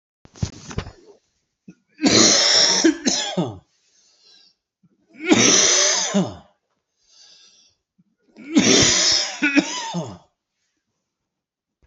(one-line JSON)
{"three_cough_length": "11.9 s", "three_cough_amplitude": 27915, "three_cough_signal_mean_std_ratio": 0.47, "survey_phase": "beta (2021-08-13 to 2022-03-07)", "age": "45-64", "gender": "Male", "wearing_mask": "No", "symptom_cough_any": true, "symptom_runny_or_blocked_nose": true, "symptom_change_to_sense_of_smell_or_taste": true, "symptom_loss_of_taste": true, "smoker_status": "Never smoked", "respiratory_condition_asthma": false, "respiratory_condition_other": false, "recruitment_source": "Test and Trace", "submission_delay": "2 days", "covid_test_result": "Positive", "covid_test_method": "LFT"}